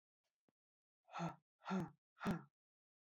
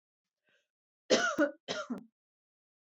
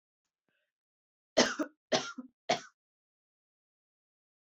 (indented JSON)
{
  "exhalation_length": "3.1 s",
  "exhalation_amplitude": 919,
  "exhalation_signal_mean_std_ratio": 0.37,
  "cough_length": "2.8 s",
  "cough_amplitude": 7679,
  "cough_signal_mean_std_ratio": 0.34,
  "three_cough_length": "4.5 s",
  "three_cough_amplitude": 10348,
  "three_cough_signal_mean_std_ratio": 0.23,
  "survey_phase": "alpha (2021-03-01 to 2021-08-12)",
  "age": "18-44",
  "gender": "Female",
  "wearing_mask": "No",
  "symptom_abdominal_pain": true,
  "smoker_status": "Never smoked",
  "respiratory_condition_asthma": false,
  "respiratory_condition_other": false,
  "recruitment_source": "REACT",
  "submission_delay": "1 day",
  "covid_test_result": "Negative",
  "covid_test_method": "RT-qPCR"
}